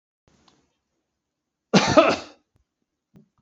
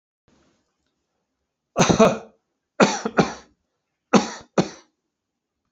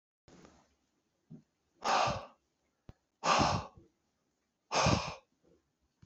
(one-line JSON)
{"cough_length": "3.4 s", "cough_amplitude": 27754, "cough_signal_mean_std_ratio": 0.26, "three_cough_length": "5.7 s", "three_cough_amplitude": 28583, "three_cough_signal_mean_std_ratio": 0.3, "exhalation_length": "6.1 s", "exhalation_amplitude": 6610, "exhalation_signal_mean_std_ratio": 0.36, "survey_phase": "alpha (2021-03-01 to 2021-08-12)", "age": "65+", "gender": "Male", "wearing_mask": "No", "symptom_none": true, "smoker_status": "Ex-smoker", "respiratory_condition_asthma": false, "respiratory_condition_other": false, "recruitment_source": "REACT", "submission_delay": "3 days", "covid_test_result": "Negative", "covid_test_method": "RT-qPCR"}